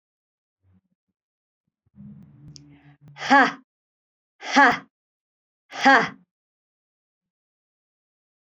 {
  "exhalation_length": "8.5 s",
  "exhalation_amplitude": 26000,
  "exhalation_signal_mean_std_ratio": 0.23,
  "survey_phase": "beta (2021-08-13 to 2022-03-07)",
  "age": "45-64",
  "gender": "Female",
  "wearing_mask": "No",
  "symptom_none": true,
  "smoker_status": "Never smoked",
  "respiratory_condition_asthma": false,
  "respiratory_condition_other": false,
  "recruitment_source": "REACT",
  "submission_delay": "3 days",
  "covid_test_result": "Negative",
  "covid_test_method": "RT-qPCR"
}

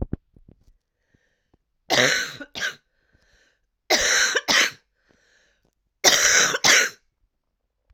{
  "three_cough_length": "7.9 s",
  "three_cough_amplitude": 32767,
  "three_cough_signal_mean_std_ratio": 0.41,
  "survey_phase": "alpha (2021-03-01 to 2021-08-12)",
  "age": "45-64",
  "gender": "Female",
  "wearing_mask": "No",
  "symptom_cough_any": true,
  "symptom_shortness_of_breath": true,
  "symptom_fatigue": true,
  "symptom_headache": true,
  "symptom_change_to_sense_of_smell_or_taste": true,
  "symptom_loss_of_taste": true,
  "smoker_status": "Never smoked",
  "respiratory_condition_asthma": true,
  "respiratory_condition_other": false,
  "recruitment_source": "Test and Trace",
  "submission_delay": "1 day",
  "covid_test_result": "Positive",
  "covid_test_method": "RT-qPCR",
  "covid_ct_value": 18.8,
  "covid_ct_gene": "ORF1ab gene",
  "covid_ct_mean": 19.6,
  "covid_viral_load": "370000 copies/ml",
  "covid_viral_load_category": "Low viral load (10K-1M copies/ml)"
}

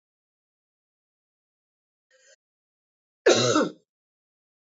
{
  "cough_length": "4.8 s",
  "cough_amplitude": 19078,
  "cough_signal_mean_std_ratio": 0.23,
  "survey_phase": "beta (2021-08-13 to 2022-03-07)",
  "age": "45-64",
  "gender": "Female",
  "wearing_mask": "No",
  "symptom_none": true,
  "smoker_status": "Ex-smoker",
  "respiratory_condition_asthma": false,
  "respiratory_condition_other": false,
  "recruitment_source": "REACT",
  "submission_delay": "3 days",
  "covid_test_result": "Negative",
  "covid_test_method": "RT-qPCR",
  "influenza_a_test_result": "Negative",
  "influenza_b_test_result": "Negative"
}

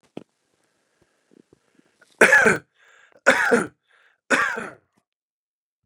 {
  "three_cough_length": "5.9 s",
  "three_cough_amplitude": 30374,
  "three_cough_signal_mean_std_ratio": 0.31,
  "survey_phase": "beta (2021-08-13 to 2022-03-07)",
  "age": "45-64",
  "gender": "Male",
  "wearing_mask": "No",
  "symptom_cough_any": true,
  "symptom_runny_or_blocked_nose": true,
  "symptom_sore_throat": true,
  "symptom_fatigue": true,
  "symptom_headache": true,
  "symptom_change_to_sense_of_smell_or_taste": true,
  "symptom_loss_of_taste": true,
  "symptom_onset": "5 days",
  "smoker_status": "Ex-smoker",
  "respiratory_condition_asthma": false,
  "respiratory_condition_other": false,
  "recruitment_source": "Test and Trace",
  "submission_delay": "1 day",
  "covid_test_result": "Positive",
  "covid_test_method": "RT-qPCR",
  "covid_ct_value": 15.8,
  "covid_ct_gene": "ORF1ab gene",
  "covid_ct_mean": 16.3,
  "covid_viral_load": "4400000 copies/ml",
  "covid_viral_load_category": "High viral load (>1M copies/ml)"
}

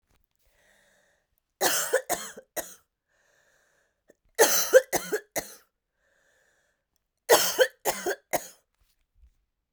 {
  "three_cough_length": "9.7 s",
  "three_cough_amplitude": 20301,
  "three_cough_signal_mean_std_ratio": 0.3,
  "survey_phase": "beta (2021-08-13 to 2022-03-07)",
  "age": "18-44",
  "gender": "Female",
  "wearing_mask": "No",
  "symptom_cough_any": true,
  "symptom_runny_or_blocked_nose": true,
  "symptom_headache": true,
  "symptom_change_to_sense_of_smell_or_taste": true,
  "symptom_loss_of_taste": true,
  "symptom_other": true,
  "smoker_status": "Current smoker (e-cigarettes or vapes only)",
  "respiratory_condition_asthma": false,
  "respiratory_condition_other": false,
  "recruitment_source": "Test and Trace",
  "submission_delay": "2 days",
  "covid_test_result": "Positive",
  "covid_test_method": "RT-qPCR",
  "covid_ct_value": 18.0,
  "covid_ct_gene": "ORF1ab gene",
  "covid_ct_mean": 18.4,
  "covid_viral_load": "920000 copies/ml",
  "covid_viral_load_category": "Low viral load (10K-1M copies/ml)"
}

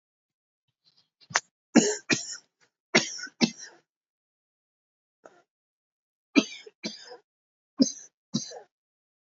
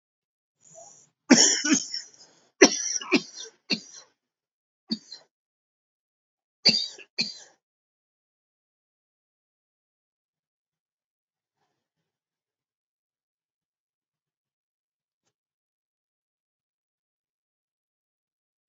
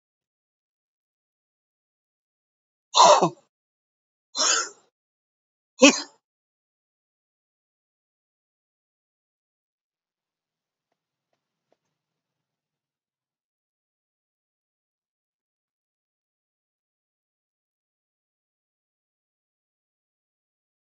{
  "three_cough_length": "9.4 s",
  "three_cough_amplitude": 25860,
  "three_cough_signal_mean_std_ratio": 0.23,
  "cough_length": "18.7 s",
  "cough_amplitude": 26219,
  "cough_signal_mean_std_ratio": 0.19,
  "exhalation_length": "21.0 s",
  "exhalation_amplitude": 27507,
  "exhalation_signal_mean_std_ratio": 0.13,
  "survey_phase": "alpha (2021-03-01 to 2021-08-12)",
  "age": "45-64",
  "gender": "Male",
  "wearing_mask": "No",
  "symptom_cough_any": true,
  "symptom_shortness_of_breath": true,
  "symptom_change_to_sense_of_smell_or_taste": true,
  "symptom_loss_of_taste": true,
  "smoker_status": "Never smoked",
  "respiratory_condition_asthma": true,
  "respiratory_condition_other": false,
  "recruitment_source": "Test and Trace",
  "submission_delay": "1 day",
  "covid_test_result": "Positive",
  "covid_test_method": "RT-qPCR",
  "covid_ct_value": 33.4,
  "covid_ct_gene": "ORF1ab gene",
  "covid_ct_mean": 33.9,
  "covid_viral_load": "7.4 copies/ml",
  "covid_viral_load_category": "Minimal viral load (< 10K copies/ml)"
}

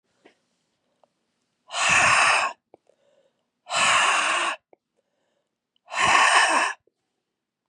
{
  "exhalation_length": "7.7 s",
  "exhalation_amplitude": 18769,
  "exhalation_signal_mean_std_ratio": 0.47,
  "survey_phase": "beta (2021-08-13 to 2022-03-07)",
  "age": "45-64",
  "gender": "Female",
  "wearing_mask": "No",
  "symptom_cough_any": true,
  "symptom_runny_or_blocked_nose": true,
  "symptom_shortness_of_breath": true,
  "symptom_sore_throat": true,
  "symptom_fatigue": true,
  "symptom_fever_high_temperature": true,
  "symptom_headache": true,
  "symptom_other": true,
  "symptom_onset": "3 days",
  "smoker_status": "Never smoked",
  "respiratory_condition_asthma": false,
  "respiratory_condition_other": false,
  "recruitment_source": "Test and Trace",
  "submission_delay": "2 days",
  "covid_test_result": "Positive",
  "covid_test_method": "RT-qPCR",
  "covid_ct_value": 15.2,
  "covid_ct_gene": "ORF1ab gene"
}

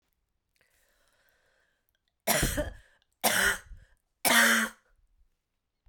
{
  "three_cough_length": "5.9 s",
  "three_cough_amplitude": 12537,
  "three_cough_signal_mean_std_ratio": 0.36,
  "survey_phase": "beta (2021-08-13 to 2022-03-07)",
  "age": "45-64",
  "gender": "Female",
  "wearing_mask": "No",
  "symptom_cough_any": true,
  "symptom_runny_or_blocked_nose": true,
  "symptom_headache": true,
  "symptom_onset": "3 days",
  "smoker_status": "Never smoked",
  "respiratory_condition_asthma": false,
  "respiratory_condition_other": false,
  "recruitment_source": "Test and Trace",
  "submission_delay": "2 days",
  "covid_test_result": "Positive",
  "covid_test_method": "RT-qPCR",
  "covid_ct_value": 15.3,
  "covid_ct_gene": "N gene",
  "covid_ct_mean": 15.4,
  "covid_viral_load": "9100000 copies/ml",
  "covid_viral_load_category": "High viral load (>1M copies/ml)"
}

